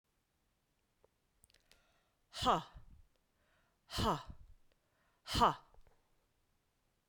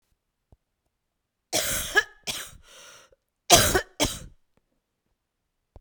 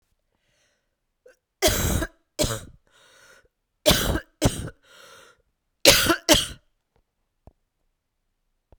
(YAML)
exhalation_length: 7.1 s
exhalation_amplitude: 4662
exhalation_signal_mean_std_ratio: 0.26
cough_length: 5.8 s
cough_amplitude: 32768
cough_signal_mean_std_ratio: 0.29
three_cough_length: 8.8 s
three_cough_amplitude: 32768
three_cough_signal_mean_std_ratio: 0.31
survey_phase: beta (2021-08-13 to 2022-03-07)
age: 45-64
gender: Female
wearing_mask: 'No'
symptom_cough_any: true
symptom_runny_or_blocked_nose: true
symptom_sore_throat: true
symptom_headache: true
symptom_change_to_sense_of_smell_or_taste: true
smoker_status: Never smoked
respiratory_condition_asthma: false
respiratory_condition_other: false
recruitment_source: Test and Trace
submission_delay: 2 days
covid_test_result: Positive
covid_test_method: RT-qPCR
covid_ct_value: 19.8
covid_ct_gene: ORF1ab gene